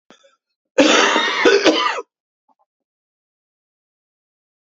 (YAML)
cough_length: 4.7 s
cough_amplitude: 32767
cough_signal_mean_std_ratio: 0.4
survey_phase: beta (2021-08-13 to 2022-03-07)
age: 45-64
gender: Male
wearing_mask: 'No'
symptom_cough_any: true
symptom_runny_or_blocked_nose: true
symptom_sore_throat: true
symptom_onset: 2 days
smoker_status: Never smoked
respiratory_condition_asthma: false
respiratory_condition_other: false
recruitment_source: Test and Trace
submission_delay: 1 day
covid_test_result: Positive
covid_test_method: RT-qPCR
covid_ct_value: 13.8
covid_ct_gene: ORF1ab gene